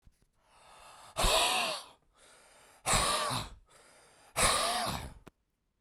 {
  "exhalation_length": "5.8 s",
  "exhalation_amplitude": 7199,
  "exhalation_signal_mean_std_ratio": 0.5,
  "survey_phase": "beta (2021-08-13 to 2022-03-07)",
  "age": "45-64",
  "gender": "Male",
  "wearing_mask": "No",
  "symptom_none": true,
  "smoker_status": "Ex-smoker",
  "respiratory_condition_asthma": false,
  "respiratory_condition_other": false,
  "recruitment_source": "REACT",
  "submission_delay": "1 day",
  "covid_test_result": "Negative",
  "covid_test_method": "RT-qPCR"
}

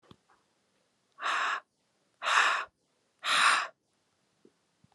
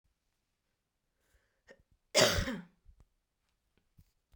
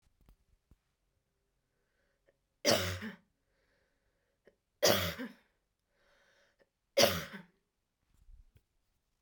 {
  "exhalation_length": "4.9 s",
  "exhalation_amplitude": 11921,
  "exhalation_signal_mean_std_ratio": 0.4,
  "cough_length": "4.4 s",
  "cough_amplitude": 9284,
  "cough_signal_mean_std_ratio": 0.23,
  "three_cough_length": "9.2 s",
  "three_cough_amplitude": 10366,
  "three_cough_signal_mean_std_ratio": 0.25,
  "survey_phase": "beta (2021-08-13 to 2022-03-07)",
  "age": "18-44",
  "gender": "Female",
  "wearing_mask": "No",
  "symptom_none": true,
  "symptom_onset": "12 days",
  "smoker_status": "Ex-smoker",
  "respiratory_condition_asthma": false,
  "respiratory_condition_other": false,
  "recruitment_source": "REACT",
  "submission_delay": "-1 day",
  "covid_test_result": "Negative",
  "covid_test_method": "RT-qPCR"
}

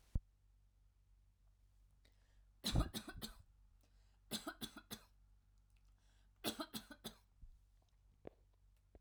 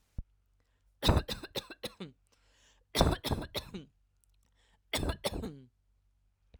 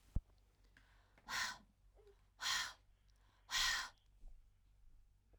{
  "three_cough_length": "9.0 s",
  "three_cough_amplitude": 1993,
  "three_cough_signal_mean_std_ratio": 0.31,
  "cough_length": "6.6 s",
  "cough_amplitude": 12376,
  "cough_signal_mean_std_ratio": 0.34,
  "exhalation_length": "5.4 s",
  "exhalation_amplitude": 1941,
  "exhalation_signal_mean_std_ratio": 0.39,
  "survey_phase": "alpha (2021-03-01 to 2021-08-12)",
  "age": "18-44",
  "gender": "Female",
  "wearing_mask": "No",
  "symptom_none": true,
  "smoker_status": "Ex-smoker",
  "respiratory_condition_asthma": false,
  "respiratory_condition_other": false,
  "recruitment_source": "REACT",
  "submission_delay": "1 day",
  "covid_test_result": "Negative",
  "covid_test_method": "RT-qPCR"
}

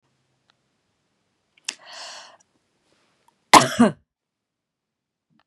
{
  "cough_length": "5.5 s",
  "cough_amplitude": 32768,
  "cough_signal_mean_std_ratio": 0.17,
  "survey_phase": "beta (2021-08-13 to 2022-03-07)",
  "age": "45-64",
  "gender": "Female",
  "wearing_mask": "No",
  "symptom_none": true,
  "smoker_status": "Ex-smoker",
  "respiratory_condition_asthma": false,
  "respiratory_condition_other": false,
  "recruitment_source": "REACT",
  "submission_delay": "2 days",
  "covid_test_result": "Negative",
  "covid_test_method": "RT-qPCR",
  "influenza_a_test_result": "Negative",
  "influenza_b_test_result": "Negative"
}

